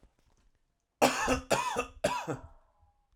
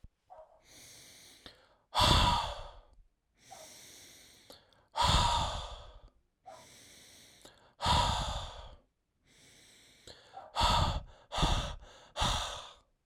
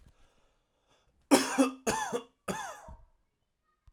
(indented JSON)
{
  "cough_length": "3.2 s",
  "cough_amplitude": 13633,
  "cough_signal_mean_std_ratio": 0.44,
  "exhalation_length": "13.1 s",
  "exhalation_amplitude": 10432,
  "exhalation_signal_mean_std_ratio": 0.44,
  "three_cough_length": "3.9 s",
  "three_cough_amplitude": 16745,
  "three_cough_signal_mean_std_ratio": 0.34,
  "survey_phase": "alpha (2021-03-01 to 2021-08-12)",
  "age": "18-44",
  "gender": "Male",
  "wearing_mask": "No",
  "symptom_none": true,
  "smoker_status": "Never smoked",
  "respiratory_condition_asthma": false,
  "respiratory_condition_other": false,
  "recruitment_source": "REACT",
  "submission_delay": "1 day",
  "covid_test_result": "Negative",
  "covid_test_method": "RT-qPCR"
}